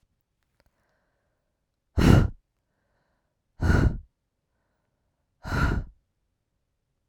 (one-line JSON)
{"exhalation_length": "7.1 s", "exhalation_amplitude": 29464, "exhalation_signal_mean_std_ratio": 0.28, "survey_phase": "beta (2021-08-13 to 2022-03-07)", "age": "18-44", "gender": "Female", "wearing_mask": "No", "symptom_runny_or_blocked_nose": true, "symptom_fatigue": true, "symptom_fever_high_temperature": true, "symptom_headache": true, "smoker_status": "Never smoked", "respiratory_condition_asthma": false, "respiratory_condition_other": false, "recruitment_source": "Test and Trace", "submission_delay": "2 days", "covid_test_result": "Positive", "covid_test_method": "RT-qPCR", "covid_ct_value": 24.0, "covid_ct_gene": "ORF1ab gene"}